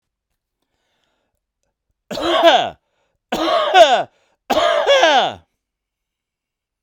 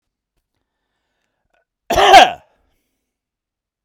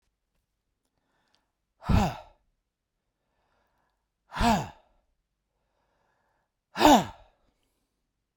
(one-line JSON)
{"three_cough_length": "6.8 s", "three_cough_amplitude": 32768, "three_cough_signal_mean_std_ratio": 0.44, "cough_length": "3.8 s", "cough_amplitude": 32768, "cough_signal_mean_std_ratio": 0.25, "exhalation_length": "8.4 s", "exhalation_amplitude": 21861, "exhalation_signal_mean_std_ratio": 0.23, "survey_phase": "beta (2021-08-13 to 2022-03-07)", "age": "65+", "gender": "Male", "wearing_mask": "No", "symptom_none": true, "symptom_onset": "12 days", "smoker_status": "Ex-smoker", "respiratory_condition_asthma": false, "respiratory_condition_other": false, "recruitment_source": "REACT", "submission_delay": "1 day", "covid_test_result": "Negative", "covid_test_method": "RT-qPCR"}